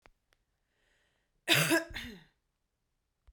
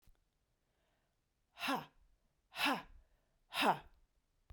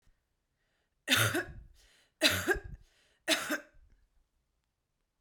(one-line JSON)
{"cough_length": "3.3 s", "cough_amplitude": 10376, "cough_signal_mean_std_ratio": 0.29, "exhalation_length": "4.5 s", "exhalation_amplitude": 3354, "exhalation_signal_mean_std_ratio": 0.32, "three_cough_length": "5.2 s", "three_cough_amplitude": 9766, "three_cough_signal_mean_std_ratio": 0.35, "survey_phase": "beta (2021-08-13 to 2022-03-07)", "age": "45-64", "gender": "Female", "wearing_mask": "No", "symptom_cough_any": true, "symptom_runny_or_blocked_nose": true, "symptom_shortness_of_breath": true, "symptom_fatigue": true, "symptom_change_to_sense_of_smell_or_taste": true, "symptom_loss_of_taste": true, "symptom_other": true, "symptom_onset": "4 days", "smoker_status": "Ex-smoker", "respiratory_condition_asthma": false, "respiratory_condition_other": false, "recruitment_source": "Test and Trace", "submission_delay": "2 days", "covid_test_result": "Positive", "covid_test_method": "ePCR"}